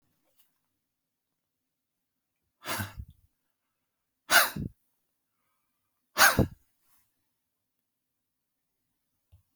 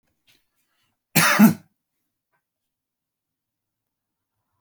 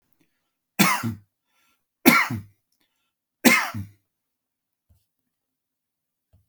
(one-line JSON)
{"exhalation_length": "9.6 s", "exhalation_amplitude": 16461, "exhalation_signal_mean_std_ratio": 0.19, "cough_length": "4.6 s", "cough_amplitude": 23744, "cough_signal_mean_std_ratio": 0.22, "three_cough_length": "6.5 s", "three_cough_amplitude": 31163, "three_cough_signal_mean_std_ratio": 0.27, "survey_phase": "alpha (2021-03-01 to 2021-08-12)", "age": "65+", "gender": "Male", "wearing_mask": "No", "symptom_none": true, "smoker_status": "Never smoked", "respiratory_condition_asthma": false, "respiratory_condition_other": false, "recruitment_source": "REACT", "submission_delay": "1 day", "covid_test_result": "Negative", "covid_test_method": "RT-qPCR"}